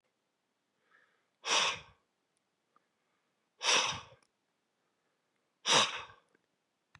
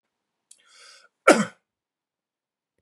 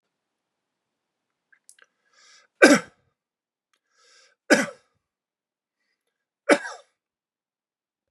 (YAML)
exhalation_length: 7.0 s
exhalation_amplitude: 6992
exhalation_signal_mean_std_ratio: 0.29
cough_length: 2.8 s
cough_amplitude: 32356
cough_signal_mean_std_ratio: 0.18
three_cough_length: 8.1 s
three_cough_amplitude: 32767
three_cough_signal_mean_std_ratio: 0.17
survey_phase: beta (2021-08-13 to 2022-03-07)
age: 45-64
gender: Male
wearing_mask: 'No'
symptom_none: true
smoker_status: Ex-smoker
respiratory_condition_asthma: false
respiratory_condition_other: false
recruitment_source: REACT
submission_delay: 1 day
covid_test_result: Negative
covid_test_method: RT-qPCR
influenza_a_test_result: Unknown/Void
influenza_b_test_result: Unknown/Void